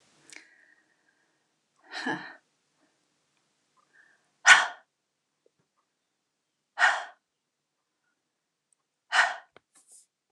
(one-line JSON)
{"exhalation_length": "10.3 s", "exhalation_amplitude": 27462, "exhalation_signal_mean_std_ratio": 0.19, "survey_phase": "beta (2021-08-13 to 2022-03-07)", "age": "45-64", "gender": "Female", "wearing_mask": "No", "symptom_cough_any": true, "symptom_fatigue": true, "symptom_onset": "5 days", "smoker_status": "Never smoked", "respiratory_condition_asthma": false, "respiratory_condition_other": false, "recruitment_source": "REACT", "submission_delay": "4 days", "covid_test_result": "Negative", "covid_test_method": "RT-qPCR", "influenza_a_test_result": "Negative", "influenza_b_test_result": "Negative"}